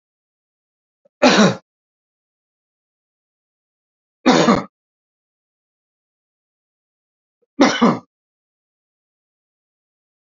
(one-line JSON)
{"three_cough_length": "10.2 s", "three_cough_amplitude": 28723, "three_cough_signal_mean_std_ratio": 0.24, "survey_phase": "beta (2021-08-13 to 2022-03-07)", "age": "45-64", "gender": "Male", "wearing_mask": "No", "symptom_cough_any": true, "symptom_runny_or_blocked_nose": true, "symptom_headache": true, "smoker_status": "Ex-smoker", "respiratory_condition_asthma": false, "respiratory_condition_other": false, "recruitment_source": "Test and Trace", "submission_delay": "2 days", "covid_test_result": "Positive", "covid_test_method": "RT-qPCR", "covid_ct_value": 19.7, "covid_ct_gene": "ORF1ab gene", "covid_ct_mean": 20.8, "covid_viral_load": "150000 copies/ml", "covid_viral_load_category": "Low viral load (10K-1M copies/ml)"}